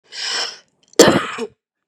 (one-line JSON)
{"cough_length": "1.9 s", "cough_amplitude": 32768, "cough_signal_mean_std_ratio": 0.39, "survey_phase": "beta (2021-08-13 to 2022-03-07)", "age": "18-44", "gender": "Female", "wearing_mask": "No", "symptom_cough_any": true, "symptom_new_continuous_cough": true, "symptom_runny_or_blocked_nose": true, "symptom_diarrhoea": true, "symptom_fatigue": true, "symptom_change_to_sense_of_smell_or_taste": true, "symptom_loss_of_taste": true, "symptom_onset": "5 days", "smoker_status": "Ex-smoker", "respiratory_condition_asthma": false, "respiratory_condition_other": true, "recruitment_source": "Test and Trace", "submission_delay": "2 days", "covid_test_result": "Positive", "covid_test_method": "RT-qPCR", "covid_ct_value": 15.5, "covid_ct_gene": "ORF1ab gene", "covid_ct_mean": 15.7, "covid_viral_load": "7000000 copies/ml", "covid_viral_load_category": "High viral load (>1M copies/ml)"}